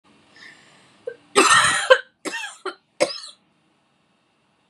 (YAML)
three_cough_length: 4.7 s
three_cough_amplitude: 31370
three_cough_signal_mean_std_ratio: 0.33
survey_phase: beta (2021-08-13 to 2022-03-07)
age: 18-44
gender: Female
wearing_mask: 'No'
symptom_cough_any: true
symptom_runny_or_blocked_nose: true
symptom_sore_throat: true
symptom_fever_high_temperature: true
symptom_headache: true
symptom_change_to_sense_of_smell_or_taste: true
smoker_status: Current smoker (1 to 10 cigarettes per day)
respiratory_condition_asthma: false
respiratory_condition_other: false
recruitment_source: Test and Trace
submission_delay: 1 day
covid_test_result: Positive
covid_test_method: ePCR